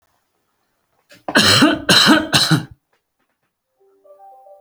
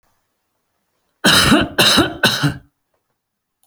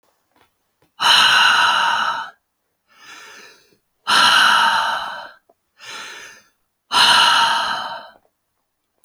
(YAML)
three_cough_length: 4.6 s
three_cough_amplitude: 32768
three_cough_signal_mean_std_ratio: 0.41
cough_length: 3.7 s
cough_amplitude: 32767
cough_signal_mean_std_ratio: 0.45
exhalation_length: 9.0 s
exhalation_amplitude: 29111
exhalation_signal_mean_std_ratio: 0.52
survey_phase: beta (2021-08-13 to 2022-03-07)
age: 45-64
gender: Male
wearing_mask: 'No'
symptom_none: true
smoker_status: Never smoked
respiratory_condition_asthma: false
respiratory_condition_other: false
recruitment_source: REACT
submission_delay: 1 day
covid_test_result: Negative
covid_test_method: RT-qPCR